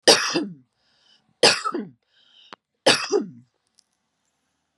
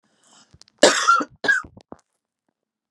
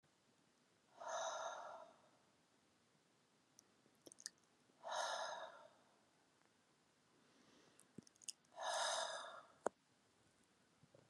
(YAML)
three_cough_length: 4.8 s
three_cough_amplitude: 32767
three_cough_signal_mean_std_ratio: 0.33
cough_length: 2.9 s
cough_amplitude: 32371
cough_signal_mean_std_ratio: 0.33
exhalation_length: 11.1 s
exhalation_amplitude: 2284
exhalation_signal_mean_std_ratio: 0.41
survey_phase: beta (2021-08-13 to 2022-03-07)
age: 45-64
gender: Female
wearing_mask: 'No'
symptom_headache: true
smoker_status: Never smoked
respiratory_condition_asthma: false
respiratory_condition_other: false
recruitment_source: REACT
submission_delay: 1 day
covid_test_result: Negative
covid_test_method: RT-qPCR